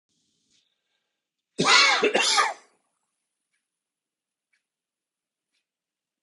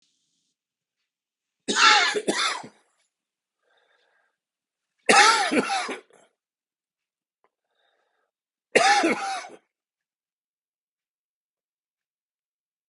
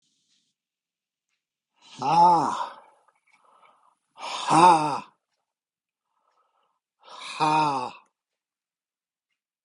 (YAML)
cough_length: 6.2 s
cough_amplitude: 20683
cough_signal_mean_std_ratio: 0.3
three_cough_length: 12.9 s
three_cough_amplitude: 28342
three_cough_signal_mean_std_ratio: 0.31
exhalation_length: 9.6 s
exhalation_amplitude: 19902
exhalation_signal_mean_std_ratio: 0.33
survey_phase: beta (2021-08-13 to 2022-03-07)
age: 65+
gender: Male
wearing_mask: 'No'
symptom_cough_any: true
smoker_status: Ex-smoker
respiratory_condition_asthma: false
respiratory_condition_other: false
recruitment_source: Test and Trace
submission_delay: 2 days
covid_test_result: Positive
covid_test_method: RT-qPCR
covid_ct_value: 18.0
covid_ct_gene: ORF1ab gene
covid_ct_mean: 18.4
covid_viral_load: 900000 copies/ml
covid_viral_load_category: Low viral load (10K-1M copies/ml)